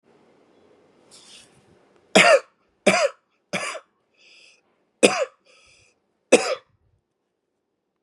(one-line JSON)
{"cough_length": "8.0 s", "cough_amplitude": 32768, "cough_signal_mean_std_ratio": 0.26, "survey_phase": "beta (2021-08-13 to 2022-03-07)", "age": "18-44", "gender": "Male", "wearing_mask": "No", "symptom_cough_any": true, "symptom_runny_or_blocked_nose": true, "symptom_sore_throat": true, "symptom_fatigue": true, "symptom_onset": "2 days", "smoker_status": "Ex-smoker", "respiratory_condition_asthma": false, "respiratory_condition_other": false, "recruitment_source": "Test and Trace", "submission_delay": "2 days", "covid_test_result": "Positive", "covid_test_method": "RT-qPCR", "covid_ct_value": 17.1, "covid_ct_gene": "ORF1ab gene", "covid_ct_mean": 17.6, "covid_viral_load": "1700000 copies/ml", "covid_viral_load_category": "High viral load (>1M copies/ml)"}